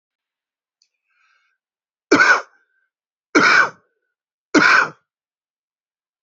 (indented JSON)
{
  "three_cough_length": "6.2 s",
  "three_cough_amplitude": 28816,
  "three_cough_signal_mean_std_ratio": 0.32,
  "survey_phase": "beta (2021-08-13 to 2022-03-07)",
  "age": "45-64",
  "gender": "Female",
  "wearing_mask": "No",
  "symptom_cough_any": true,
  "symptom_runny_or_blocked_nose": true,
  "symptom_shortness_of_breath": true,
  "symptom_sore_throat": true,
  "symptom_fatigue": true,
  "symptom_fever_high_temperature": true,
  "symptom_headache": true,
  "symptom_change_to_sense_of_smell_or_taste": true,
  "symptom_loss_of_taste": true,
  "smoker_status": "Current smoker (e-cigarettes or vapes only)",
  "respiratory_condition_asthma": false,
  "respiratory_condition_other": true,
  "recruitment_source": "Test and Trace",
  "submission_delay": "2 days",
  "covid_test_result": "Positive",
  "covid_test_method": "RT-qPCR",
  "covid_ct_value": 32.7,
  "covid_ct_gene": "ORF1ab gene"
}